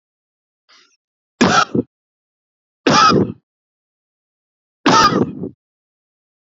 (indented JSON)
{
  "three_cough_length": "6.6 s",
  "three_cough_amplitude": 30314,
  "three_cough_signal_mean_std_ratio": 0.35,
  "survey_phase": "beta (2021-08-13 to 2022-03-07)",
  "age": "45-64",
  "gender": "Male",
  "wearing_mask": "No",
  "symptom_none": true,
  "smoker_status": "Ex-smoker",
  "respiratory_condition_asthma": false,
  "respiratory_condition_other": false,
  "recruitment_source": "REACT",
  "submission_delay": "1 day",
  "covid_test_result": "Negative",
  "covid_test_method": "RT-qPCR",
  "influenza_a_test_result": "Negative",
  "influenza_b_test_result": "Negative"
}